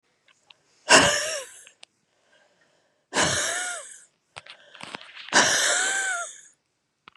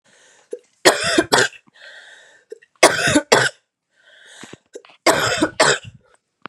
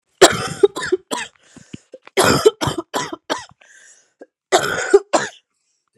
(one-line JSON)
{"exhalation_length": "7.2 s", "exhalation_amplitude": 30967, "exhalation_signal_mean_std_ratio": 0.42, "three_cough_length": "6.5 s", "three_cough_amplitude": 32768, "three_cough_signal_mean_std_ratio": 0.4, "cough_length": "6.0 s", "cough_amplitude": 32768, "cough_signal_mean_std_ratio": 0.38, "survey_phase": "beta (2021-08-13 to 2022-03-07)", "age": "18-44", "gender": "Female", "wearing_mask": "No", "symptom_cough_any": true, "symptom_runny_or_blocked_nose": true, "symptom_onset": "4 days", "smoker_status": "Ex-smoker", "respiratory_condition_asthma": false, "respiratory_condition_other": false, "recruitment_source": "Test and Trace", "submission_delay": "2 days", "covid_test_result": "Positive", "covid_test_method": "ePCR"}